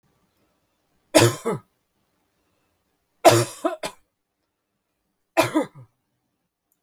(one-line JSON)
{"three_cough_length": "6.8 s", "three_cough_amplitude": 32768, "three_cough_signal_mean_std_ratio": 0.25, "survey_phase": "beta (2021-08-13 to 2022-03-07)", "age": "45-64", "gender": "Female", "wearing_mask": "No", "symptom_none": true, "smoker_status": "Never smoked", "respiratory_condition_asthma": false, "respiratory_condition_other": false, "recruitment_source": "REACT", "submission_delay": "0 days", "covid_test_result": "Negative", "covid_test_method": "RT-qPCR", "influenza_a_test_result": "Negative", "influenza_b_test_result": "Negative"}